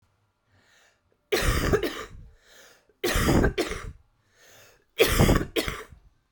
{"three_cough_length": "6.3 s", "three_cough_amplitude": 18456, "three_cough_signal_mean_std_ratio": 0.46, "survey_phase": "alpha (2021-03-01 to 2021-08-12)", "age": "45-64", "gender": "Female", "wearing_mask": "No", "symptom_cough_any": true, "symptom_abdominal_pain": true, "symptom_diarrhoea": true, "symptom_fatigue": true, "symptom_headache": true, "symptom_change_to_sense_of_smell_or_taste": true, "symptom_loss_of_taste": true, "smoker_status": "Current smoker (11 or more cigarettes per day)", "respiratory_condition_asthma": false, "respiratory_condition_other": false, "recruitment_source": "Test and Trace", "submission_delay": "1 day", "covid_test_result": "Positive", "covid_test_method": "RT-qPCR", "covid_ct_value": 16.5, "covid_ct_gene": "ORF1ab gene", "covid_ct_mean": 18.4, "covid_viral_load": "920000 copies/ml", "covid_viral_load_category": "Low viral load (10K-1M copies/ml)"}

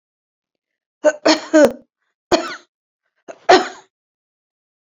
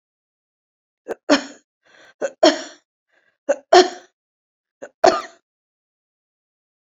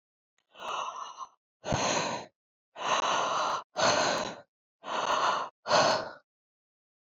{"three_cough_length": "4.9 s", "three_cough_amplitude": 30012, "three_cough_signal_mean_std_ratio": 0.3, "cough_length": "7.0 s", "cough_amplitude": 32768, "cough_signal_mean_std_ratio": 0.23, "exhalation_length": "7.1 s", "exhalation_amplitude": 9655, "exhalation_signal_mean_std_ratio": 0.59, "survey_phase": "beta (2021-08-13 to 2022-03-07)", "age": "65+", "gender": "Female", "wearing_mask": "No", "symptom_prefer_not_to_say": true, "smoker_status": "Never smoked", "respiratory_condition_asthma": true, "respiratory_condition_other": false, "recruitment_source": "REACT", "submission_delay": "3 days", "covid_test_result": "Negative", "covid_test_method": "RT-qPCR"}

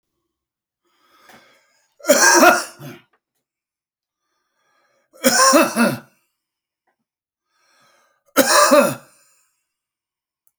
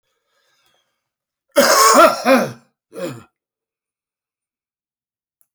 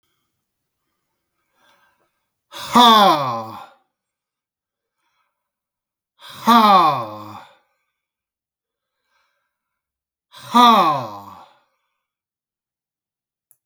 {"three_cough_length": "10.6 s", "three_cough_amplitude": 32767, "three_cough_signal_mean_std_ratio": 0.33, "cough_length": "5.5 s", "cough_amplitude": 32768, "cough_signal_mean_std_ratio": 0.33, "exhalation_length": "13.7 s", "exhalation_amplitude": 32601, "exhalation_signal_mean_std_ratio": 0.29, "survey_phase": "alpha (2021-03-01 to 2021-08-12)", "age": "65+", "gender": "Male", "wearing_mask": "No", "symptom_none": true, "smoker_status": "Ex-smoker", "respiratory_condition_asthma": false, "respiratory_condition_other": false, "recruitment_source": "REACT", "submission_delay": "2 days", "covid_test_result": "Negative", "covid_test_method": "RT-qPCR"}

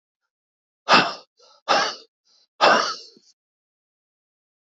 {"exhalation_length": "4.8 s", "exhalation_amplitude": 26272, "exhalation_signal_mean_std_ratio": 0.31, "survey_phase": "beta (2021-08-13 to 2022-03-07)", "age": "65+", "gender": "Male", "wearing_mask": "No", "symptom_shortness_of_breath": true, "symptom_onset": "6 days", "smoker_status": "Ex-smoker", "respiratory_condition_asthma": false, "respiratory_condition_other": false, "recruitment_source": "REACT", "submission_delay": "0 days", "covid_test_result": "Negative", "covid_test_method": "RT-qPCR", "influenza_a_test_result": "Negative", "influenza_b_test_result": "Negative"}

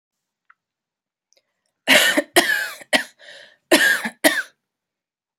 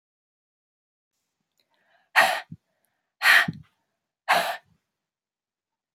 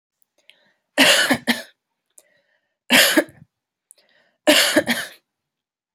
{"cough_length": "5.4 s", "cough_amplitude": 32768, "cough_signal_mean_std_ratio": 0.37, "exhalation_length": "5.9 s", "exhalation_amplitude": 25720, "exhalation_signal_mean_std_ratio": 0.27, "three_cough_length": "5.9 s", "three_cough_amplitude": 29600, "three_cough_signal_mean_std_ratio": 0.37, "survey_phase": "alpha (2021-03-01 to 2021-08-12)", "age": "18-44", "gender": "Female", "wearing_mask": "No", "symptom_cough_any": true, "symptom_fatigue": true, "symptom_headache": true, "symptom_onset": "3 days", "smoker_status": "Never smoked", "respiratory_condition_asthma": false, "respiratory_condition_other": false, "recruitment_source": "Test and Trace", "submission_delay": "2 days", "covid_test_result": "Positive", "covid_test_method": "RT-qPCR"}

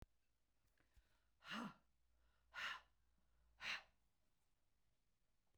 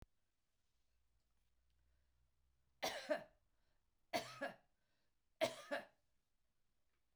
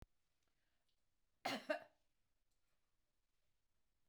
{"exhalation_length": "5.6 s", "exhalation_amplitude": 507, "exhalation_signal_mean_std_ratio": 0.35, "three_cough_length": "7.2 s", "three_cough_amplitude": 1711, "three_cough_signal_mean_std_ratio": 0.28, "cough_length": "4.1 s", "cough_amplitude": 1258, "cough_signal_mean_std_ratio": 0.23, "survey_phase": "beta (2021-08-13 to 2022-03-07)", "age": "65+", "gender": "Female", "wearing_mask": "No", "symptom_none": true, "smoker_status": "Never smoked", "respiratory_condition_asthma": false, "respiratory_condition_other": false, "recruitment_source": "REACT", "submission_delay": "1 day", "covid_test_result": "Negative", "covid_test_method": "RT-qPCR"}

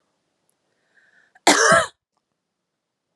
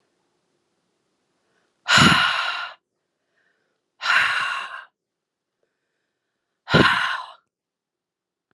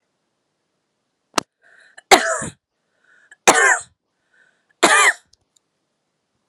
{"cough_length": "3.2 s", "cough_amplitude": 28007, "cough_signal_mean_std_ratio": 0.28, "exhalation_length": "8.5 s", "exhalation_amplitude": 28207, "exhalation_signal_mean_std_ratio": 0.35, "three_cough_length": "6.5 s", "three_cough_amplitude": 32768, "three_cough_signal_mean_std_ratio": 0.28, "survey_phase": "alpha (2021-03-01 to 2021-08-12)", "age": "45-64", "gender": "Female", "wearing_mask": "No", "symptom_headache": true, "symptom_change_to_sense_of_smell_or_taste": true, "symptom_onset": "6 days", "smoker_status": "Never smoked", "respiratory_condition_asthma": false, "respiratory_condition_other": false, "recruitment_source": "Test and Trace", "submission_delay": "2 days", "covid_test_result": "Positive", "covid_test_method": "RT-qPCR", "covid_ct_value": 18.3, "covid_ct_gene": "N gene", "covid_ct_mean": 18.7, "covid_viral_load": "720000 copies/ml", "covid_viral_load_category": "Low viral load (10K-1M copies/ml)"}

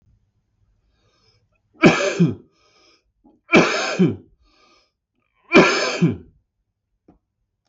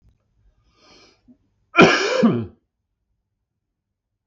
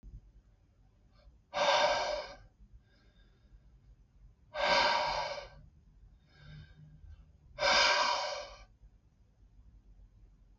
{"three_cough_length": "7.7 s", "three_cough_amplitude": 32766, "three_cough_signal_mean_std_ratio": 0.34, "cough_length": "4.3 s", "cough_amplitude": 32768, "cough_signal_mean_std_ratio": 0.29, "exhalation_length": "10.6 s", "exhalation_amplitude": 5714, "exhalation_signal_mean_std_ratio": 0.43, "survey_phase": "beta (2021-08-13 to 2022-03-07)", "age": "45-64", "gender": "Male", "wearing_mask": "No", "symptom_cough_any": true, "symptom_runny_or_blocked_nose": true, "symptom_headache": true, "symptom_onset": "4 days", "smoker_status": "Never smoked", "respiratory_condition_asthma": false, "respiratory_condition_other": false, "recruitment_source": "Test and Trace", "submission_delay": "1 day", "covid_test_result": "Positive", "covid_test_method": "RT-qPCR"}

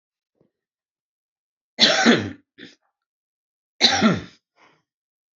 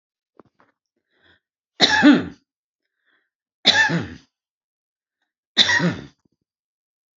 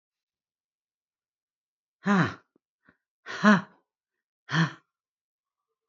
{"cough_length": "5.4 s", "cough_amplitude": 32768, "cough_signal_mean_std_ratio": 0.31, "three_cough_length": "7.2 s", "three_cough_amplitude": 32570, "three_cough_signal_mean_std_ratio": 0.31, "exhalation_length": "5.9 s", "exhalation_amplitude": 20566, "exhalation_signal_mean_std_ratio": 0.24, "survey_phase": "alpha (2021-03-01 to 2021-08-12)", "age": "45-64", "gender": "Female", "wearing_mask": "No", "symptom_none": true, "smoker_status": "Current smoker (e-cigarettes or vapes only)", "respiratory_condition_asthma": false, "respiratory_condition_other": false, "recruitment_source": "REACT", "submission_delay": "1 day", "covid_test_result": "Negative", "covid_test_method": "RT-qPCR"}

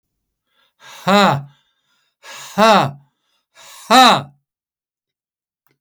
{"exhalation_length": "5.8 s", "exhalation_amplitude": 32203, "exhalation_signal_mean_std_ratio": 0.33, "survey_phase": "alpha (2021-03-01 to 2021-08-12)", "age": "65+", "gender": "Male", "wearing_mask": "No", "symptom_none": true, "smoker_status": "Never smoked", "respiratory_condition_asthma": false, "respiratory_condition_other": false, "recruitment_source": "REACT", "submission_delay": "1 day", "covid_test_result": "Negative", "covid_test_method": "RT-qPCR"}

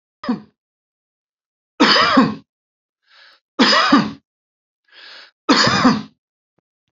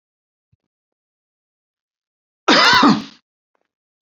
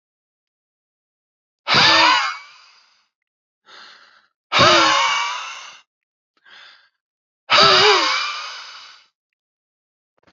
{"three_cough_length": "6.9 s", "three_cough_amplitude": 31556, "three_cough_signal_mean_std_ratio": 0.4, "cough_length": "4.0 s", "cough_amplitude": 31513, "cough_signal_mean_std_ratio": 0.3, "exhalation_length": "10.3 s", "exhalation_amplitude": 32767, "exhalation_signal_mean_std_ratio": 0.4, "survey_phase": "beta (2021-08-13 to 2022-03-07)", "age": "45-64", "gender": "Male", "wearing_mask": "No", "symptom_none": true, "smoker_status": "Never smoked", "respiratory_condition_asthma": false, "respiratory_condition_other": false, "recruitment_source": "Test and Trace", "submission_delay": "1 day", "covid_test_result": "Negative", "covid_test_method": "RT-qPCR"}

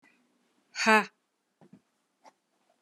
{"exhalation_length": "2.8 s", "exhalation_amplitude": 13072, "exhalation_signal_mean_std_ratio": 0.22, "survey_phase": "alpha (2021-03-01 to 2021-08-12)", "age": "65+", "gender": "Female", "wearing_mask": "No", "symptom_cough_any": true, "symptom_fatigue": true, "symptom_headache": true, "smoker_status": "Never smoked", "respiratory_condition_asthma": false, "respiratory_condition_other": false, "recruitment_source": "Test and Trace", "submission_delay": "2 days", "covid_test_result": "Positive", "covid_test_method": "RT-qPCR", "covid_ct_value": 12.7, "covid_ct_gene": "ORF1ab gene", "covid_ct_mean": 13.0, "covid_viral_load": "53000000 copies/ml", "covid_viral_load_category": "High viral load (>1M copies/ml)"}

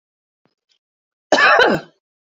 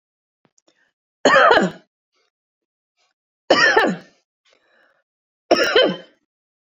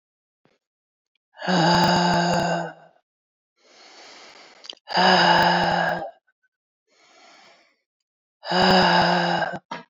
{"cough_length": "2.4 s", "cough_amplitude": 27984, "cough_signal_mean_std_ratio": 0.36, "three_cough_length": "6.7 s", "three_cough_amplitude": 32768, "three_cough_signal_mean_std_ratio": 0.35, "exhalation_length": "9.9 s", "exhalation_amplitude": 19137, "exhalation_signal_mean_std_ratio": 0.52, "survey_phase": "beta (2021-08-13 to 2022-03-07)", "age": "45-64", "gender": "Female", "wearing_mask": "No", "symptom_none": true, "smoker_status": "Never smoked", "respiratory_condition_asthma": false, "respiratory_condition_other": false, "recruitment_source": "REACT", "submission_delay": "3 days", "covid_test_result": "Negative", "covid_test_method": "RT-qPCR", "influenza_a_test_result": "Negative", "influenza_b_test_result": "Negative"}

